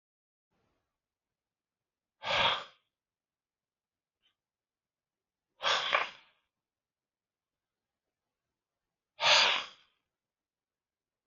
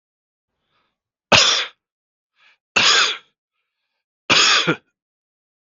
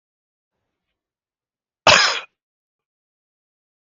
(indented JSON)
{
  "exhalation_length": "11.3 s",
  "exhalation_amplitude": 9464,
  "exhalation_signal_mean_std_ratio": 0.25,
  "three_cough_length": "5.7 s",
  "three_cough_amplitude": 32768,
  "three_cough_signal_mean_std_ratio": 0.36,
  "cough_length": "3.8 s",
  "cough_amplitude": 32768,
  "cough_signal_mean_std_ratio": 0.21,
  "survey_phase": "beta (2021-08-13 to 2022-03-07)",
  "age": "45-64",
  "gender": "Male",
  "wearing_mask": "No",
  "symptom_cough_any": true,
  "symptom_shortness_of_breath": true,
  "symptom_onset": "8 days",
  "smoker_status": "Never smoked",
  "respiratory_condition_asthma": true,
  "respiratory_condition_other": false,
  "recruitment_source": "REACT",
  "submission_delay": "6 days",
  "covid_test_result": "Negative",
  "covid_test_method": "RT-qPCR",
  "influenza_a_test_result": "Unknown/Void",
  "influenza_b_test_result": "Unknown/Void"
}